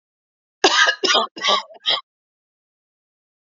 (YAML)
cough_length: 3.5 s
cough_amplitude: 31954
cough_signal_mean_std_ratio: 0.39
survey_phase: beta (2021-08-13 to 2022-03-07)
age: 65+
gender: Female
wearing_mask: 'No'
symptom_none: true
smoker_status: Ex-smoker
respiratory_condition_asthma: true
respiratory_condition_other: false
recruitment_source: Test and Trace
submission_delay: 0 days
covid_test_result: Negative
covid_test_method: LFT